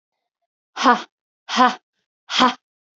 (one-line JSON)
{"exhalation_length": "3.0 s", "exhalation_amplitude": 32767, "exhalation_signal_mean_std_ratio": 0.33, "survey_phase": "beta (2021-08-13 to 2022-03-07)", "age": "18-44", "gender": "Female", "wearing_mask": "No", "symptom_none": true, "smoker_status": "Ex-smoker", "respiratory_condition_asthma": false, "respiratory_condition_other": false, "recruitment_source": "REACT", "submission_delay": "1 day", "covid_test_result": "Negative", "covid_test_method": "RT-qPCR"}